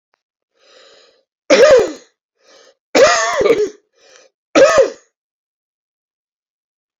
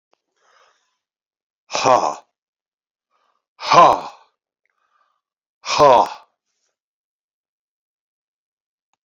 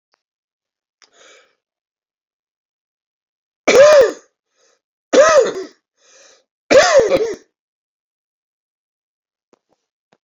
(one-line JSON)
{"three_cough_length": "7.0 s", "three_cough_amplitude": 30549, "three_cough_signal_mean_std_ratio": 0.38, "exhalation_length": "9.0 s", "exhalation_amplitude": 28868, "exhalation_signal_mean_std_ratio": 0.25, "cough_length": "10.2 s", "cough_amplitude": 32767, "cough_signal_mean_std_ratio": 0.31, "survey_phase": "beta (2021-08-13 to 2022-03-07)", "age": "65+", "gender": "Male", "wearing_mask": "No", "symptom_cough_any": true, "symptom_runny_or_blocked_nose": true, "symptom_fatigue": true, "symptom_headache": true, "smoker_status": "Ex-smoker", "respiratory_condition_asthma": false, "respiratory_condition_other": false, "recruitment_source": "Test and Trace", "submission_delay": "1 day", "covid_test_result": "Positive", "covid_test_method": "RT-qPCR", "covid_ct_value": 15.8, "covid_ct_gene": "ORF1ab gene", "covid_ct_mean": 16.5, "covid_viral_load": "3900000 copies/ml", "covid_viral_load_category": "High viral load (>1M copies/ml)"}